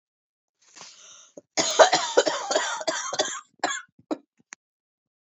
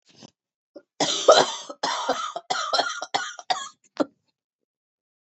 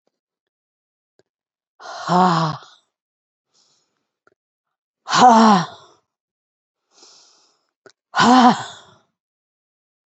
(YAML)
cough_length: 5.3 s
cough_amplitude: 27261
cough_signal_mean_std_ratio: 0.38
three_cough_length: 5.2 s
three_cough_amplitude: 26585
three_cough_signal_mean_std_ratio: 0.39
exhalation_length: 10.2 s
exhalation_amplitude: 29495
exhalation_signal_mean_std_ratio: 0.3
survey_phase: beta (2021-08-13 to 2022-03-07)
age: 45-64
gender: Female
wearing_mask: 'No'
symptom_cough_any: true
symptom_fatigue: true
symptom_headache: true
symptom_change_to_sense_of_smell_or_taste: true
symptom_onset: 3 days
smoker_status: Never smoked
respiratory_condition_asthma: false
respiratory_condition_other: false
recruitment_source: Test and Trace
submission_delay: 2 days
covid_test_result: Positive
covid_test_method: RT-qPCR
covid_ct_value: 20.4
covid_ct_gene: ORF1ab gene
covid_ct_mean: 21.7
covid_viral_load: 78000 copies/ml
covid_viral_load_category: Low viral load (10K-1M copies/ml)